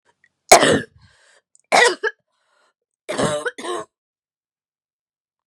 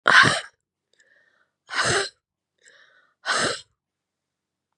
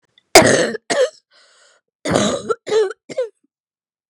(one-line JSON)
{"three_cough_length": "5.5 s", "three_cough_amplitude": 32768, "three_cough_signal_mean_std_ratio": 0.3, "exhalation_length": "4.8 s", "exhalation_amplitude": 32605, "exhalation_signal_mean_std_ratio": 0.32, "cough_length": "4.1 s", "cough_amplitude": 32768, "cough_signal_mean_std_ratio": 0.42, "survey_phase": "beta (2021-08-13 to 2022-03-07)", "age": "45-64", "gender": "Female", "wearing_mask": "No", "symptom_cough_any": true, "symptom_runny_or_blocked_nose": true, "symptom_shortness_of_breath": true, "symptom_sore_throat": true, "symptom_diarrhoea": true, "symptom_fatigue": true, "symptom_headache": true, "symptom_onset": "2 days", "smoker_status": "Ex-smoker", "respiratory_condition_asthma": true, "respiratory_condition_other": false, "recruitment_source": "Test and Trace", "submission_delay": "2 days", "covid_test_result": "Positive", "covid_test_method": "RT-qPCR", "covid_ct_value": 22.7, "covid_ct_gene": "N gene", "covid_ct_mean": 23.0, "covid_viral_load": "29000 copies/ml", "covid_viral_load_category": "Low viral load (10K-1M copies/ml)"}